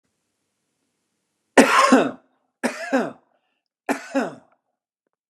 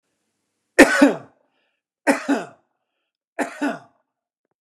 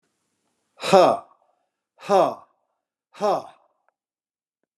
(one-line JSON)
{"three_cough_length": "5.3 s", "three_cough_amplitude": 29204, "three_cough_signal_mean_std_ratio": 0.32, "cough_length": "4.6 s", "cough_amplitude": 29204, "cough_signal_mean_std_ratio": 0.29, "exhalation_length": "4.8 s", "exhalation_amplitude": 26530, "exhalation_signal_mean_std_ratio": 0.29, "survey_phase": "beta (2021-08-13 to 2022-03-07)", "age": "45-64", "gender": "Male", "wearing_mask": "No", "symptom_none": true, "smoker_status": "Never smoked", "respiratory_condition_asthma": false, "respiratory_condition_other": false, "recruitment_source": "REACT", "submission_delay": "3 days", "covid_test_result": "Negative", "covid_test_method": "RT-qPCR", "influenza_a_test_result": "Negative", "influenza_b_test_result": "Negative"}